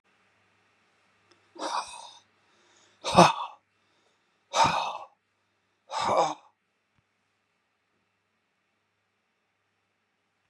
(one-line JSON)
{"exhalation_length": "10.5 s", "exhalation_amplitude": 27165, "exhalation_signal_mean_std_ratio": 0.25, "survey_phase": "beta (2021-08-13 to 2022-03-07)", "age": "65+", "gender": "Male", "wearing_mask": "No", "symptom_none": true, "smoker_status": "Never smoked", "respiratory_condition_asthma": false, "respiratory_condition_other": false, "recruitment_source": "REACT", "submission_delay": "1 day", "covid_test_result": "Negative", "covid_test_method": "RT-qPCR"}